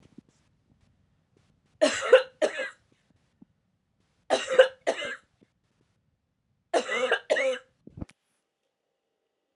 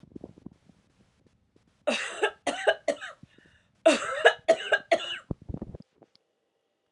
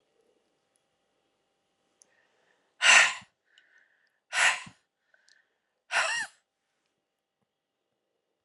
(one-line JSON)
{"three_cough_length": "9.6 s", "three_cough_amplitude": 21092, "three_cough_signal_mean_std_ratio": 0.29, "cough_length": "6.9 s", "cough_amplitude": 21763, "cough_signal_mean_std_ratio": 0.34, "exhalation_length": "8.4 s", "exhalation_amplitude": 18005, "exhalation_signal_mean_std_ratio": 0.23, "survey_phase": "alpha (2021-03-01 to 2021-08-12)", "age": "45-64", "gender": "Female", "wearing_mask": "No", "symptom_cough_any": true, "symptom_new_continuous_cough": true, "symptom_fatigue": true, "symptom_headache": true, "symptom_change_to_sense_of_smell_or_taste": true, "symptom_loss_of_taste": true, "symptom_onset": "3 days", "smoker_status": "Never smoked", "respiratory_condition_asthma": true, "respiratory_condition_other": false, "recruitment_source": "Test and Trace", "submission_delay": "1 day", "covid_test_result": "Positive", "covid_test_method": "RT-qPCR", "covid_ct_value": 13.2, "covid_ct_gene": "N gene", "covid_ct_mean": 13.6, "covid_viral_load": "34000000 copies/ml", "covid_viral_load_category": "High viral load (>1M copies/ml)"}